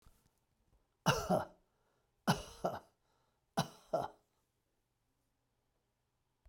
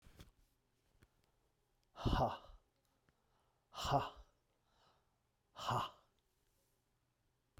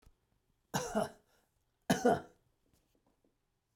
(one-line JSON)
{"three_cough_length": "6.5 s", "three_cough_amplitude": 4430, "three_cough_signal_mean_std_ratio": 0.28, "exhalation_length": "7.6 s", "exhalation_amplitude": 2744, "exhalation_signal_mean_std_ratio": 0.29, "cough_length": "3.8 s", "cough_amplitude": 5284, "cough_signal_mean_std_ratio": 0.29, "survey_phase": "beta (2021-08-13 to 2022-03-07)", "age": "65+", "gender": "Male", "wearing_mask": "No", "symptom_none": true, "smoker_status": "Never smoked", "respiratory_condition_asthma": false, "respiratory_condition_other": false, "recruitment_source": "REACT", "submission_delay": "5 days", "covid_test_result": "Negative", "covid_test_method": "RT-qPCR"}